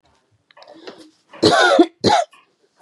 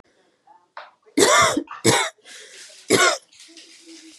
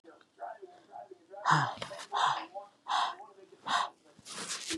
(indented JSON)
{
  "cough_length": "2.8 s",
  "cough_amplitude": 31041,
  "cough_signal_mean_std_ratio": 0.41,
  "three_cough_length": "4.2 s",
  "three_cough_amplitude": 31335,
  "three_cough_signal_mean_std_ratio": 0.42,
  "exhalation_length": "4.8 s",
  "exhalation_amplitude": 8067,
  "exhalation_signal_mean_std_ratio": 0.51,
  "survey_phase": "beta (2021-08-13 to 2022-03-07)",
  "age": "18-44",
  "gender": "Female",
  "wearing_mask": "No",
  "symptom_change_to_sense_of_smell_or_taste": true,
  "smoker_status": "Never smoked",
  "respiratory_condition_asthma": false,
  "respiratory_condition_other": false,
  "recruitment_source": "REACT",
  "submission_delay": "2 days",
  "covid_test_result": "Negative",
  "covid_test_method": "RT-qPCR",
  "influenza_a_test_result": "Negative",
  "influenza_b_test_result": "Negative"
}